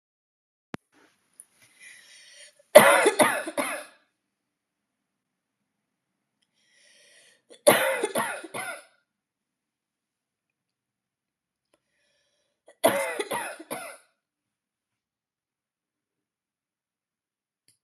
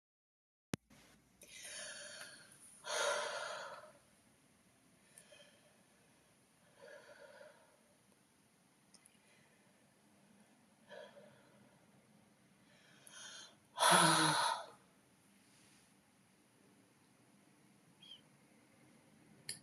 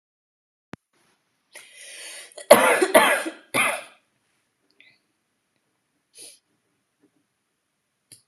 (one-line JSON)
{"three_cough_length": "17.8 s", "three_cough_amplitude": 32768, "three_cough_signal_mean_std_ratio": 0.22, "exhalation_length": "19.6 s", "exhalation_amplitude": 6006, "exhalation_signal_mean_std_ratio": 0.28, "cough_length": "8.3 s", "cough_amplitude": 32768, "cough_signal_mean_std_ratio": 0.25, "survey_phase": "alpha (2021-03-01 to 2021-08-12)", "age": "18-44", "gender": "Female", "wearing_mask": "No", "symptom_none": true, "smoker_status": "Never smoked", "respiratory_condition_asthma": false, "respiratory_condition_other": false, "recruitment_source": "REACT", "submission_delay": "3 days", "covid_test_result": "Negative", "covid_test_method": "RT-qPCR"}